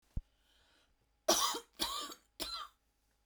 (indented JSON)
{
  "three_cough_length": "3.3 s",
  "three_cough_amplitude": 5841,
  "three_cough_signal_mean_std_ratio": 0.38,
  "survey_phase": "beta (2021-08-13 to 2022-03-07)",
  "age": "18-44",
  "gender": "Female",
  "wearing_mask": "No",
  "symptom_none": true,
  "smoker_status": "Ex-smoker",
  "respiratory_condition_asthma": true,
  "respiratory_condition_other": false,
  "recruitment_source": "REACT",
  "submission_delay": "1 day",
  "covid_test_result": "Negative",
  "covid_test_method": "RT-qPCR"
}